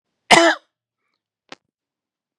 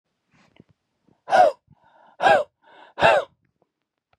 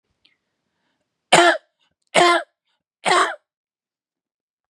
{"cough_length": "2.4 s", "cough_amplitude": 32768, "cough_signal_mean_std_ratio": 0.25, "exhalation_length": "4.2 s", "exhalation_amplitude": 27297, "exhalation_signal_mean_std_ratio": 0.32, "three_cough_length": "4.7 s", "three_cough_amplitude": 32767, "three_cough_signal_mean_std_ratio": 0.32, "survey_phase": "beta (2021-08-13 to 2022-03-07)", "age": "18-44", "gender": "Male", "wearing_mask": "No", "symptom_cough_any": true, "symptom_sore_throat": true, "symptom_fatigue": true, "symptom_fever_high_temperature": true, "symptom_headache": true, "smoker_status": "Never smoked", "respiratory_condition_asthma": false, "respiratory_condition_other": false, "recruitment_source": "Test and Trace", "submission_delay": "0 days", "covid_test_result": "Positive", "covid_test_method": "LFT"}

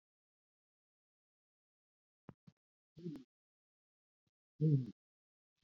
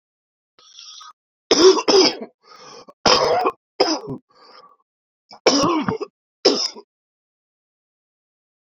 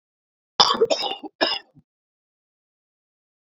{"exhalation_length": "5.6 s", "exhalation_amplitude": 2353, "exhalation_signal_mean_std_ratio": 0.2, "three_cough_length": "8.6 s", "three_cough_amplitude": 32321, "three_cough_signal_mean_std_ratio": 0.38, "cough_length": "3.6 s", "cough_amplitude": 32767, "cough_signal_mean_std_ratio": 0.29, "survey_phase": "beta (2021-08-13 to 2022-03-07)", "age": "45-64", "gender": "Male", "wearing_mask": "No", "symptom_cough_any": true, "symptom_runny_or_blocked_nose": true, "symptom_sore_throat": true, "symptom_fatigue": true, "symptom_change_to_sense_of_smell_or_taste": true, "symptom_loss_of_taste": true, "symptom_onset": "3 days", "smoker_status": "Current smoker (1 to 10 cigarettes per day)", "respiratory_condition_asthma": false, "respiratory_condition_other": false, "recruitment_source": "Test and Trace", "submission_delay": "1 day", "covid_test_result": "Positive", "covid_test_method": "RT-qPCR", "covid_ct_value": 13.1, "covid_ct_gene": "ORF1ab gene", "covid_ct_mean": 13.9, "covid_viral_load": "28000000 copies/ml", "covid_viral_load_category": "High viral load (>1M copies/ml)"}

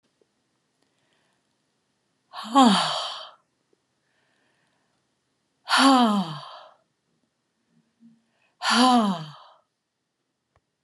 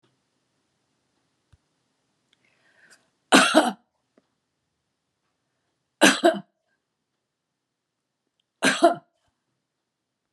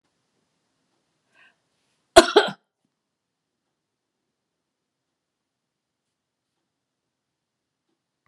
{"exhalation_length": "10.8 s", "exhalation_amplitude": 22327, "exhalation_signal_mean_std_ratio": 0.32, "three_cough_length": "10.3 s", "three_cough_amplitude": 32767, "three_cough_signal_mean_std_ratio": 0.22, "cough_length": "8.3 s", "cough_amplitude": 32768, "cough_signal_mean_std_ratio": 0.11, "survey_phase": "beta (2021-08-13 to 2022-03-07)", "age": "65+", "gender": "Female", "wearing_mask": "No", "symptom_none": true, "symptom_onset": "12 days", "smoker_status": "Ex-smoker", "respiratory_condition_asthma": false, "respiratory_condition_other": false, "recruitment_source": "REACT", "submission_delay": "3 days", "covid_test_result": "Negative", "covid_test_method": "RT-qPCR", "influenza_a_test_result": "Negative", "influenza_b_test_result": "Negative"}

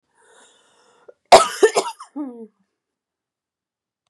{"cough_length": "4.1 s", "cough_amplitude": 32768, "cough_signal_mean_std_ratio": 0.23, "survey_phase": "beta (2021-08-13 to 2022-03-07)", "age": "18-44", "gender": "Female", "wearing_mask": "No", "symptom_cough_any": true, "symptom_new_continuous_cough": true, "symptom_runny_or_blocked_nose": true, "symptom_shortness_of_breath": true, "symptom_fatigue": true, "symptom_headache": true, "symptom_other": true, "symptom_onset": "3 days", "smoker_status": "Never smoked", "respiratory_condition_asthma": false, "respiratory_condition_other": false, "recruitment_source": "Test and Trace", "submission_delay": "2 days", "covid_test_result": "Positive", "covid_test_method": "RT-qPCR", "covid_ct_value": 30.9, "covid_ct_gene": "ORF1ab gene", "covid_ct_mean": 31.7, "covid_viral_load": "39 copies/ml", "covid_viral_load_category": "Minimal viral load (< 10K copies/ml)"}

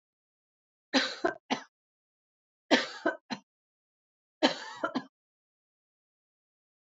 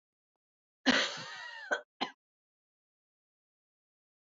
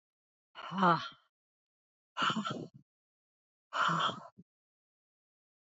{"three_cough_length": "6.9 s", "three_cough_amplitude": 15486, "three_cough_signal_mean_std_ratio": 0.27, "cough_length": "4.3 s", "cough_amplitude": 9069, "cough_signal_mean_std_ratio": 0.27, "exhalation_length": "5.6 s", "exhalation_amplitude": 7341, "exhalation_signal_mean_std_ratio": 0.35, "survey_phase": "beta (2021-08-13 to 2022-03-07)", "age": "45-64", "gender": "Female", "wearing_mask": "No", "symptom_cough_any": true, "symptom_runny_or_blocked_nose": true, "symptom_fatigue": true, "symptom_change_to_sense_of_smell_or_taste": true, "symptom_loss_of_taste": true, "symptom_onset": "4 days", "smoker_status": "Never smoked", "respiratory_condition_asthma": false, "respiratory_condition_other": false, "recruitment_source": "Test and Trace", "submission_delay": "1 day", "covid_test_result": "Positive", "covid_test_method": "RT-qPCR", "covid_ct_value": 31.4, "covid_ct_gene": "N gene"}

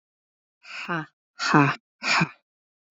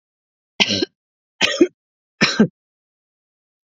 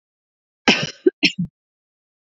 {"exhalation_length": "2.9 s", "exhalation_amplitude": 25309, "exhalation_signal_mean_std_ratio": 0.37, "three_cough_length": "3.7 s", "three_cough_amplitude": 32768, "three_cough_signal_mean_std_ratio": 0.31, "cough_length": "2.4 s", "cough_amplitude": 30517, "cough_signal_mean_std_ratio": 0.28, "survey_phase": "beta (2021-08-13 to 2022-03-07)", "age": "18-44", "gender": "Female", "wearing_mask": "No", "symptom_none": true, "smoker_status": "Ex-smoker", "respiratory_condition_asthma": false, "respiratory_condition_other": false, "recruitment_source": "REACT", "submission_delay": "3 days", "covid_test_result": "Negative", "covid_test_method": "RT-qPCR", "influenza_a_test_result": "Negative", "influenza_b_test_result": "Negative"}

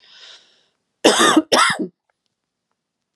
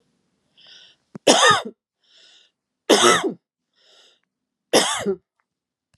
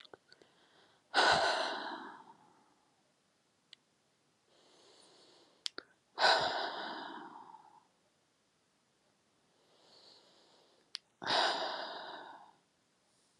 {"cough_length": "3.2 s", "cough_amplitude": 32767, "cough_signal_mean_std_ratio": 0.37, "three_cough_length": "6.0 s", "three_cough_amplitude": 32767, "three_cough_signal_mean_std_ratio": 0.33, "exhalation_length": "13.4 s", "exhalation_amplitude": 6398, "exhalation_signal_mean_std_ratio": 0.34, "survey_phase": "beta (2021-08-13 to 2022-03-07)", "age": "45-64", "gender": "Female", "wearing_mask": "No", "symptom_cough_any": true, "symptom_onset": "3 days", "smoker_status": "Ex-smoker", "respiratory_condition_asthma": false, "respiratory_condition_other": false, "recruitment_source": "REACT", "submission_delay": "2 days", "covid_test_result": "Negative", "covid_test_method": "RT-qPCR"}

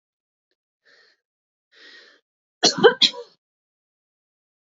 {"cough_length": "4.7 s", "cough_amplitude": 26360, "cough_signal_mean_std_ratio": 0.2, "survey_phase": "beta (2021-08-13 to 2022-03-07)", "age": "18-44", "gender": "Female", "wearing_mask": "No", "symptom_cough_any": true, "symptom_runny_or_blocked_nose": true, "symptom_abdominal_pain": true, "symptom_fatigue": true, "symptom_fever_high_temperature": true, "symptom_onset": "3 days", "smoker_status": "Never smoked", "respiratory_condition_asthma": true, "respiratory_condition_other": false, "recruitment_source": "Test and Trace", "submission_delay": "2 days", "covid_test_result": "Positive", "covid_test_method": "RT-qPCR", "covid_ct_value": 18.5, "covid_ct_gene": "ORF1ab gene", "covid_ct_mean": 18.7, "covid_viral_load": "710000 copies/ml", "covid_viral_load_category": "Low viral load (10K-1M copies/ml)"}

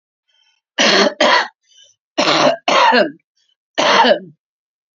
{"cough_length": "4.9 s", "cough_amplitude": 31708, "cough_signal_mean_std_ratio": 0.53, "survey_phase": "beta (2021-08-13 to 2022-03-07)", "age": "45-64", "gender": "Female", "wearing_mask": "No", "symptom_cough_any": true, "symptom_shortness_of_breath": true, "smoker_status": "Current smoker (11 or more cigarettes per day)", "respiratory_condition_asthma": false, "respiratory_condition_other": false, "recruitment_source": "REACT", "submission_delay": "2 days", "covid_test_result": "Negative", "covid_test_method": "RT-qPCR", "influenza_a_test_result": "Negative", "influenza_b_test_result": "Negative"}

